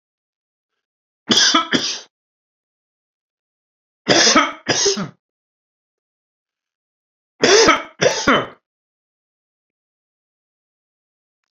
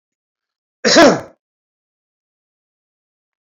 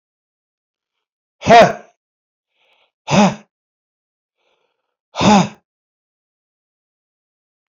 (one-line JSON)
{"three_cough_length": "11.5 s", "three_cough_amplitude": 30865, "three_cough_signal_mean_std_ratio": 0.33, "cough_length": "3.4 s", "cough_amplitude": 31203, "cough_signal_mean_std_ratio": 0.25, "exhalation_length": "7.7 s", "exhalation_amplitude": 28715, "exhalation_signal_mean_std_ratio": 0.25, "survey_phase": "beta (2021-08-13 to 2022-03-07)", "age": "65+", "gender": "Male", "wearing_mask": "No", "symptom_none": true, "smoker_status": "Ex-smoker", "respiratory_condition_asthma": false, "respiratory_condition_other": false, "recruitment_source": "REACT", "submission_delay": "0 days", "covid_test_result": "Negative", "covid_test_method": "RT-qPCR"}